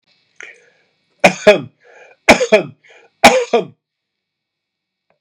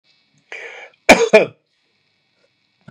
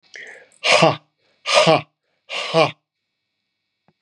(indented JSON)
{
  "three_cough_length": "5.2 s",
  "three_cough_amplitude": 32768,
  "three_cough_signal_mean_std_ratio": 0.3,
  "cough_length": "2.9 s",
  "cough_amplitude": 32768,
  "cough_signal_mean_std_ratio": 0.25,
  "exhalation_length": "4.0 s",
  "exhalation_amplitude": 32209,
  "exhalation_signal_mean_std_ratio": 0.37,
  "survey_phase": "beta (2021-08-13 to 2022-03-07)",
  "age": "45-64",
  "gender": "Male",
  "wearing_mask": "No",
  "symptom_fatigue": true,
  "smoker_status": "Never smoked",
  "respiratory_condition_asthma": true,
  "respiratory_condition_other": false,
  "recruitment_source": "REACT",
  "submission_delay": "1 day",
  "covid_test_result": "Negative",
  "covid_test_method": "RT-qPCR"
}